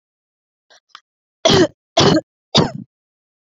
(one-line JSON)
{"three_cough_length": "3.5 s", "three_cough_amplitude": 30630, "three_cough_signal_mean_std_ratio": 0.35, "survey_phase": "beta (2021-08-13 to 2022-03-07)", "age": "18-44", "gender": "Female", "wearing_mask": "No", "symptom_none": true, "smoker_status": "Never smoked", "respiratory_condition_asthma": false, "respiratory_condition_other": false, "recruitment_source": "REACT", "submission_delay": "3 days", "covid_test_result": "Negative", "covid_test_method": "RT-qPCR"}